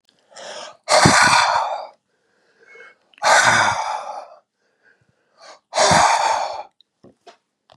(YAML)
exhalation_length: 7.8 s
exhalation_amplitude: 32768
exhalation_signal_mean_std_ratio: 0.48
survey_phase: beta (2021-08-13 to 2022-03-07)
age: 65+
gender: Male
wearing_mask: 'No'
symptom_none: true
smoker_status: Ex-smoker
respiratory_condition_asthma: false
respiratory_condition_other: false
recruitment_source: REACT
submission_delay: 2 days
covid_test_result: Negative
covid_test_method: RT-qPCR
influenza_a_test_result: Negative
influenza_b_test_result: Negative